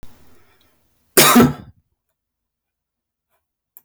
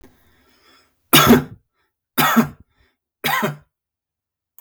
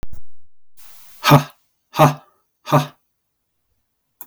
{
  "cough_length": "3.8 s",
  "cough_amplitude": 32768,
  "cough_signal_mean_std_ratio": 0.26,
  "three_cough_length": "4.6 s",
  "three_cough_amplitude": 32768,
  "three_cough_signal_mean_std_ratio": 0.33,
  "exhalation_length": "4.3 s",
  "exhalation_amplitude": 32766,
  "exhalation_signal_mean_std_ratio": 0.36,
  "survey_phase": "beta (2021-08-13 to 2022-03-07)",
  "age": "45-64",
  "gender": "Male",
  "wearing_mask": "No",
  "symptom_none": true,
  "smoker_status": "Never smoked",
  "respiratory_condition_asthma": false,
  "respiratory_condition_other": false,
  "recruitment_source": "REACT",
  "submission_delay": "1 day",
  "covid_test_result": "Negative",
  "covid_test_method": "RT-qPCR"
}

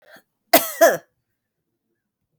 {
  "cough_length": "2.4 s",
  "cough_amplitude": 32768,
  "cough_signal_mean_std_ratio": 0.26,
  "survey_phase": "beta (2021-08-13 to 2022-03-07)",
  "age": "45-64",
  "gender": "Female",
  "wearing_mask": "No",
  "symptom_cough_any": true,
  "symptom_runny_or_blocked_nose": true,
  "symptom_sore_throat": true,
  "symptom_fatigue": true,
  "symptom_other": true,
  "symptom_onset": "4 days",
  "smoker_status": "Never smoked",
  "respiratory_condition_asthma": false,
  "respiratory_condition_other": false,
  "recruitment_source": "Test and Trace",
  "submission_delay": "1 day",
  "covid_test_result": "Positive",
  "covid_test_method": "RT-qPCR",
  "covid_ct_value": 21.9,
  "covid_ct_gene": "ORF1ab gene"
}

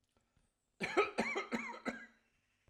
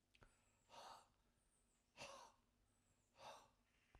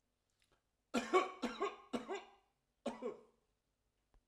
{
  "cough_length": "2.7 s",
  "cough_amplitude": 3854,
  "cough_signal_mean_std_ratio": 0.43,
  "exhalation_length": "4.0 s",
  "exhalation_amplitude": 185,
  "exhalation_signal_mean_std_ratio": 0.53,
  "three_cough_length": "4.3 s",
  "three_cough_amplitude": 3405,
  "three_cough_signal_mean_std_ratio": 0.35,
  "survey_phase": "alpha (2021-03-01 to 2021-08-12)",
  "age": "45-64",
  "gender": "Male",
  "wearing_mask": "No",
  "symptom_none": true,
  "smoker_status": "Ex-smoker",
  "respiratory_condition_asthma": false,
  "respiratory_condition_other": false,
  "recruitment_source": "REACT",
  "submission_delay": "1 day",
  "covid_test_result": "Negative",
  "covid_test_method": "RT-qPCR"
}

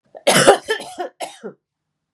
{
  "cough_length": "2.1 s",
  "cough_amplitude": 32768,
  "cough_signal_mean_std_ratio": 0.38,
  "survey_phase": "beta (2021-08-13 to 2022-03-07)",
  "age": "45-64",
  "gender": "Female",
  "wearing_mask": "No",
  "symptom_cough_any": true,
  "symptom_runny_or_blocked_nose": true,
  "smoker_status": "Never smoked",
  "respiratory_condition_asthma": false,
  "respiratory_condition_other": false,
  "recruitment_source": "Test and Trace",
  "submission_delay": "1 day",
  "covid_test_result": "Positive",
  "covid_test_method": "RT-qPCR"
}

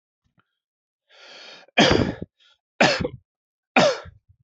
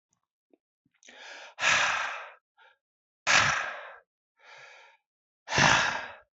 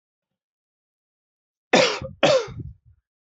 {
  "three_cough_length": "4.4 s",
  "three_cough_amplitude": 27301,
  "three_cough_signal_mean_std_ratio": 0.34,
  "exhalation_length": "6.4 s",
  "exhalation_amplitude": 13061,
  "exhalation_signal_mean_std_ratio": 0.4,
  "cough_length": "3.2 s",
  "cough_amplitude": 26592,
  "cough_signal_mean_std_ratio": 0.32,
  "survey_phase": "beta (2021-08-13 to 2022-03-07)",
  "age": "45-64",
  "gender": "Male",
  "wearing_mask": "No",
  "symptom_none": true,
  "smoker_status": "Never smoked",
  "respiratory_condition_asthma": false,
  "respiratory_condition_other": false,
  "recruitment_source": "REACT",
  "submission_delay": "2 days",
  "covid_test_result": "Negative",
  "covid_test_method": "RT-qPCR",
  "influenza_a_test_result": "Negative",
  "influenza_b_test_result": "Negative"
}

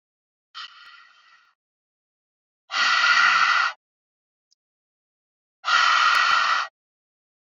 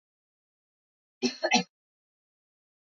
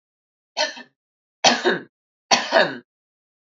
{
  "exhalation_length": "7.4 s",
  "exhalation_amplitude": 17307,
  "exhalation_signal_mean_std_ratio": 0.45,
  "cough_length": "2.8 s",
  "cough_amplitude": 10984,
  "cough_signal_mean_std_ratio": 0.23,
  "three_cough_length": "3.6 s",
  "three_cough_amplitude": 27932,
  "three_cough_signal_mean_std_ratio": 0.35,
  "survey_phase": "beta (2021-08-13 to 2022-03-07)",
  "age": "18-44",
  "gender": "Female",
  "wearing_mask": "No",
  "symptom_runny_or_blocked_nose": true,
  "symptom_sore_throat": true,
  "symptom_diarrhoea": true,
  "symptom_fatigue": true,
  "symptom_headache": true,
  "symptom_onset": "4 days",
  "smoker_status": "Never smoked",
  "respiratory_condition_asthma": false,
  "respiratory_condition_other": false,
  "recruitment_source": "Test and Trace",
  "submission_delay": "1 day",
  "covid_test_result": "Positive",
  "covid_test_method": "RT-qPCR",
  "covid_ct_value": 22.6,
  "covid_ct_gene": "ORF1ab gene"
}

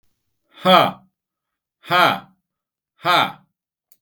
{
  "exhalation_length": "4.0 s",
  "exhalation_amplitude": 32766,
  "exhalation_signal_mean_std_ratio": 0.35,
  "survey_phase": "beta (2021-08-13 to 2022-03-07)",
  "age": "45-64",
  "gender": "Male",
  "wearing_mask": "No",
  "symptom_none": true,
  "smoker_status": "Never smoked",
  "respiratory_condition_asthma": false,
  "respiratory_condition_other": false,
  "recruitment_source": "REACT",
  "submission_delay": "3 days",
  "covid_test_result": "Negative",
  "covid_test_method": "RT-qPCR",
  "influenza_a_test_result": "Unknown/Void",
  "influenza_b_test_result": "Unknown/Void"
}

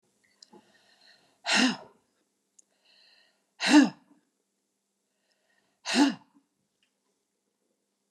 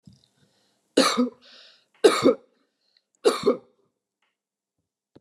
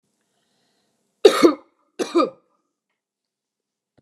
{
  "exhalation_length": "8.1 s",
  "exhalation_amplitude": 15476,
  "exhalation_signal_mean_std_ratio": 0.24,
  "three_cough_length": "5.2 s",
  "three_cough_amplitude": 22033,
  "three_cough_signal_mean_std_ratio": 0.3,
  "cough_length": "4.0 s",
  "cough_amplitude": 32768,
  "cough_signal_mean_std_ratio": 0.24,
  "survey_phase": "beta (2021-08-13 to 2022-03-07)",
  "age": "45-64",
  "gender": "Female",
  "wearing_mask": "No",
  "symptom_none": true,
  "smoker_status": "Ex-smoker",
  "respiratory_condition_asthma": false,
  "respiratory_condition_other": false,
  "recruitment_source": "REACT",
  "submission_delay": "3 days",
  "covid_test_result": "Negative",
  "covid_test_method": "RT-qPCR"
}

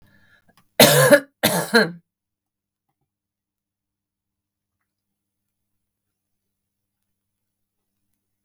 {
  "cough_length": "8.4 s",
  "cough_amplitude": 32768,
  "cough_signal_mean_std_ratio": 0.22,
  "survey_phase": "beta (2021-08-13 to 2022-03-07)",
  "age": "18-44",
  "gender": "Female",
  "wearing_mask": "No",
  "symptom_none": true,
  "smoker_status": "Current smoker (1 to 10 cigarettes per day)",
  "respiratory_condition_asthma": false,
  "respiratory_condition_other": false,
  "recruitment_source": "REACT",
  "submission_delay": "6 days",
  "covid_test_result": "Negative",
  "covid_test_method": "RT-qPCR"
}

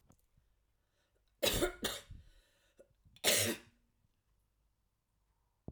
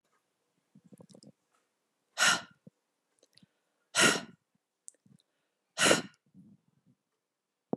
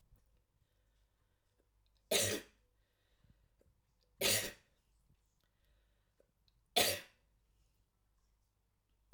{
  "cough_length": "5.7 s",
  "cough_amplitude": 5653,
  "cough_signal_mean_std_ratio": 0.3,
  "exhalation_length": "7.8 s",
  "exhalation_amplitude": 11786,
  "exhalation_signal_mean_std_ratio": 0.24,
  "three_cough_length": "9.1 s",
  "three_cough_amplitude": 6248,
  "three_cough_signal_mean_std_ratio": 0.24,
  "survey_phase": "alpha (2021-03-01 to 2021-08-12)",
  "age": "18-44",
  "gender": "Female",
  "wearing_mask": "No",
  "symptom_fatigue": true,
  "smoker_status": "Never smoked",
  "respiratory_condition_asthma": false,
  "respiratory_condition_other": false,
  "recruitment_source": "REACT",
  "submission_delay": "1 day",
  "covid_test_result": "Negative",
  "covid_test_method": "RT-qPCR"
}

